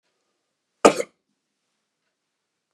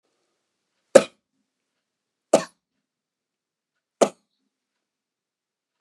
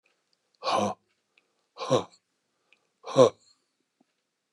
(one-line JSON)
{"cough_length": "2.7 s", "cough_amplitude": 32768, "cough_signal_mean_std_ratio": 0.14, "three_cough_length": "5.8 s", "three_cough_amplitude": 32768, "three_cough_signal_mean_std_ratio": 0.12, "exhalation_length": "4.5 s", "exhalation_amplitude": 19986, "exhalation_signal_mean_std_ratio": 0.26, "survey_phase": "beta (2021-08-13 to 2022-03-07)", "age": "65+", "gender": "Male", "wearing_mask": "No", "symptom_none": true, "smoker_status": "Never smoked", "respiratory_condition_asthma": false, "respiratory_condition_other": false, "recruitment_source": "REACT", "submission_delay": "1 day", "covid_test_result": "Negative", "covid_test_method": "RT-qPCR", "influenza_a_test_result": "Negative", "influenza_b_test_result": "Negative"}